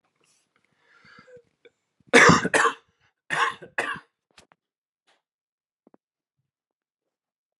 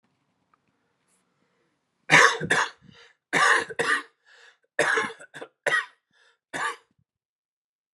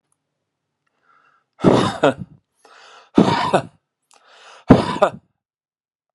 {
  "cough_length": "7.6 s",
  "cough_amplitude": 27558,
  "cough_signal_mean_std_ratio": 0.24,
  "three_cough_length": "7.9 s",
  "three_cough_amplitude": 27763,
  "three_cough_signal_mean_std_ratio": 0.35,
  "exhalation_length": "6.1 s",
  "exhalation_amplitude": 32768,
  "exhalation_signal_mean_std_ratio": 0.32,
  "survey_phase": "alpha (2021-03-01 to 2021-08-12)",
  "age": "18-44",
  "gender": "Male",
  "wearing_mask": "No",
  "symptom_none": true,
  "symptom_onset": "6 days",
  "smoker_status": "Never smoked",
  "respiratory_condition_asthma": false,
  "respiratory_condition_other": false,
  "recruitment_source": "REACT",
  "submission_delay": "1 day",
  "covid_test_result": "Negative",
  "covid_test_method": "RT-qPCR"
}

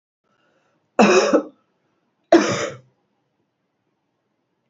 {
  "cough_length": "4.7 s",
  "cough_amplitude": 32768,
  "cough_signal_mean_std_ratio": 0.31,
  "survey_phase": "beta (2021-08-13 to 2022-03-07)",
  "age": "45-64",
  "gender": "Female",
  "wearing_mask": "No",
  "symptom_runny_or_blocked_nose": true,
  "symptom_sore_throat": true,
  "symptom_fatigue": true,
  "symptom_fever_high_temperature": true,
  "symptom_headache": true,
  "symptom_onset": "3 days",
  "smoker_status": "Current smoker (1 to 10 cigarettes per day)",
  "respiratory_condition_asthma": false,
  "respiratory_condition_other": false,
  "recruitment_source": "Test and Trace",
  "submission_delay": "2 days",
  "covid_test_result": "Positive",
  "covid_test_method": "ePCR"
}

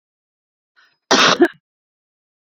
{
  "cough_length": "2.6 s",
  "cough_amplitude": 31523,
  "cough_signal_mean_std_ratio": 0.29,
  "survey_phase": "beta (2021-08-13 to 2022-03-07)",
  "age": "18-44",
  "gender": "Female",
  "wearing_mask": "Yes",
  "symptom_none": true,
  "smoker_status": "Current smoker (e-cigarettes or vapes only)",
  "respiratory_condition_asthma": false,
  "respiratory_condition_other": false,
  "recruitment_source": "REACT",
  "submission_delay": "2 days",
  "covid_test_result": "Negative",
  "covid_test_method": "RT-qPCR"
}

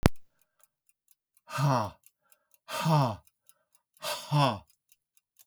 {
  "exhalation_length": "5.5 s",
  "exhalation_amplitude": 25304,
  "exhalation_signal_mean_std_ratio": 0.39,
  "survey_phase": "alpha (2021-03-01 to 2021-08-12)",
  "age": "65+",
  "gender": "Male",
  "wearing_mask": "No",
  "symptom_cough_any": true,
  "symptom_fatigue": true,
  "smoker_status": "Never smoked",
  "respiratory_condition_asthma": false,
  "respiratory_condition_other": false,
  "recruitment_source": "REACT",
  "submission_delay": "3 days",
  "covid_test_result": "Negative",
  "covid_test_method": "RT-qPCR"
}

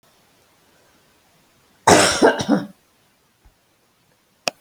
{
  "cough_length": "4.6 s",
  "cough_amplitude": 30312,
  "cough_signal_mean_std_ratio": 0.3,
  "survey_phase": "alpha (2021-03-01 to 2021-08-12)",
  "age": "45-64",
  "gender": "Female",
  "wearing_mask": "No",
  "symptom_none": true,
  "smoker_status": "Ex-smoker",
  "respiratory_condition_asthma": false,
  "respiratory_condition_other": false,
  "recruitment_source": "REACT",
  "submission_delay": "2 days",
  "covid_test_result": "Negative",
  "covid_test_method": "RT-qPCR"
}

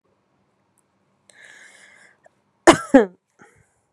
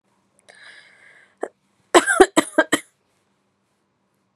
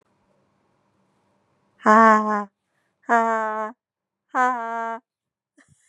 {
  "cough_length": "3.9 s",
  "cough_amplitude": 32768,
  "cough_signal_mean_std_ratio": 0.18,
  "three_cough_length": "4.4 s",
  "three_cough_amplitude": 32767,
  "three_cough_signal_mean_std_ratio": 0.23,
  "exhalation_length": "5.9 s",
  "exhalation_amplitude": 29750,
  "exhalation_signal_mean_std_ratio": 0.34,
  "survey_phase": "beta (2021-08-13 to 2022-03-07)",
  "age": "45-64",
  "gender": "Female",
  "wearing_mask": "No",
  "symptom_none": true,
  "smoker_status": "Never smoked",
  "respiratory_condition_asthma": false,
  "respiratory_condition_other": false,
  "recruitment_source": "REACT",
  "submission_delay": "4 days",
  "covid_test_result": "Negative",
  "covid_test_method": "RT-qPCR"
}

